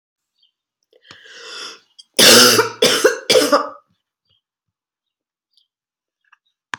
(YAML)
cough_length: 6.8 s
cough_amplitude: 32768
cough_signal_mean_std_ratio: 0.34
survey_phase: beta (2021-08-13 to 2022-03-07)
age: 65+
gender: Female
wearing_mask: 'No'
symptom_cough_any: true
symptom_onset: 3 days
smoker_status: Ex-smoker
respiratory_condition_asthma: false
respiratory_condition_other: false
recruitment_source: Test and Trace
submission_delay: 2 days
covid_test_result: Positive
covid_test_method: RT-qPCR
covid_ct_value: 15.5
covid_ct_gene: ORF1ab gene
covid_ct_mean: 15.7
covid_viral_load: 6900000 copies/ml
covid_viral_load_category: High viral load (>1M copies/ml)